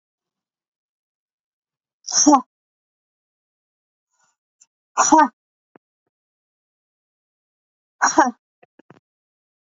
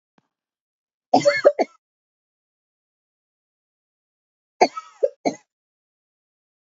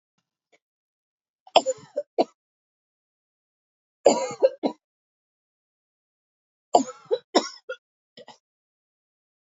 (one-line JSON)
{"exhalation_length": "9.6 s", "exhalation_amplitude": 28133, "exhalation_signal_mean_std_ratio": 0.22, "cough_length": "6.7 s", "cough_amplitude": 29253, "cough_signal_mean_std_ratio": 0.21, "three_cough_length": "9.6 s", "three_cough_amplitude": 26770, "three_cough_signal_mean_std_ratio": 0.21, "survey_phase": "beta (2021-08-13 to 2022-03-07)", "age": "65+", "gender": "Female", "wearing_mask": "No", "symptom_runny_or_blocked_nose": true, "symptom_fatigue": true, "symptom_headache": true, "symptom_other": true, "symptom_onset": "12 days", "smoker_status": "Ex-smoker", "respiratory_condition_asthma": false, "respiratory_condition_other": false, "recruitment_source": "REACT", "submission_delay": "4 days", "covid_test_result": "Negative", "covid_test_method": "RT-qPCR", "influenza_a_test_result": "Unknown/Void", "influenza_b_test_result": "Unknown/Void"}